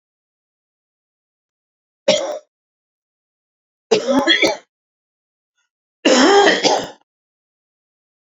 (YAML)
three_cough_length: 8.3 s
three_cough_amplitude: 31011
three_cough_signal_mean_std_ratio: 0.35
survey_phase: beta (2021-08-13 to 2022-03-07)
age: 65+
gender: Male
wearing_mask: 'No'
symptom_cough_any: true
symptom_runny_or_blocked_nose: true
symptom_sore_throat: true
symptom_fever_high_temperature: true
symptom_onset: 2 days
smoker_status: Never smoked
respiratory_condition_asthma: false
respiratory_condition_other: false
recruitment_source: Test and Trace
submission_delay: 1 day
covid_test_result: Positive
covid_test_method: RT-qPCR
covid_ct_value: 14.3
covid_ct_gene: ORF1ab gene
covid_ct_mean: 14.8
covid_viral_load: 14000000 copies/ml
covid_viral_load_category: High viral load (>1M copies/ml)